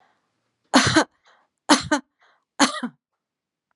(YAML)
three_cough_length: 3.8 s
three_cough_amplitude: 32767
three_cough_signal_mean_std_ratio: 0.31
survey_phase: beta (2021-08-13 to 2022-03-07)
age: 45-64
gender: Female
wearing_mask: 'No'
symptom_none: true
smoker_status: Never smoked
respiratory_condition_asthma: false
respiratory_condition_other: false
recruitment_source: REACT
submission_delay: 2 days
covid_test_result: Negative
covid_test_method: RT-qPCR